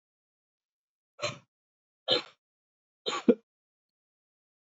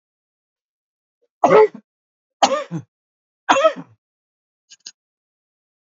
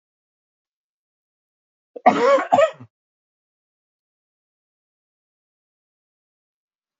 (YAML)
exhalation_length: 4.6 s
exhalation_amplitude: 11573
exhalation_signal_mean_std_ratio: 0.2
three_cough_length: 6.0 s
three_cough_amplitude: 29478
three_cough_signal_mean_std_ratio: 0.26
cough_length: 7.0 s
cough_amplitude: 26783
cough_signal_mean_std_ratio: 0.22
survey_phase: alpha (2021-03-01 to 2021-08-12)
age: 45-64
gender: Male
wearing_mask: 'No'
symptom_cough_any: true
symptom_shortness_of_breath: true
symptom_abdominal_pain: true
symptom_fatigue: true
symptom_fever_high_temperature: true
symptom_change_to_sense_of_smell_or_taste: true
symptom_loss_of_taste: true
symptom_onset: 3 days
smoker_status: Never smoked
respiratory_condition_asthma: false
respiratory_condition_other: false
recruitment_source: Test and Trace
submission_delay: 2 days
covid_test_result: Positive
covid_test_method: RT-qPCR